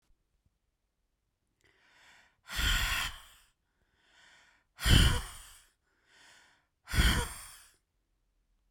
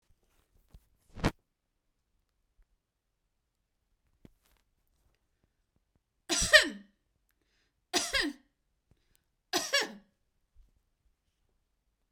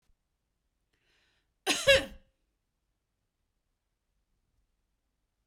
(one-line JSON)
{"exhalation_length": "8.7 s", "exhalation_amplitude": 11768, "exhalation_signal_mean_std_ratio": 0.31, "three_cough_length": "12.1 s", "three_cough_amplitude": 18004, "three_cough_signal_mean_std_ratio": 0.2, "cough_length": "5.5 s", "cough_amplitude": 9911, "cough_signal_mean_std_ratio": 0.18, "survey_phase": "beta (2021-08-13 to 2022-03-07)", "age": "45-64", "gender": "Female", "wearing_mask": "No", "symptom_none": true, "smoker_status": "Never smoked", "respiratory_condition_asthma": false, "respiratory_condition_other": false, "recruitment_source": "REACT", "submission_delay": "2 days", "covid_test_result": "Negative", "covid_test_method": "RT-qPCR"}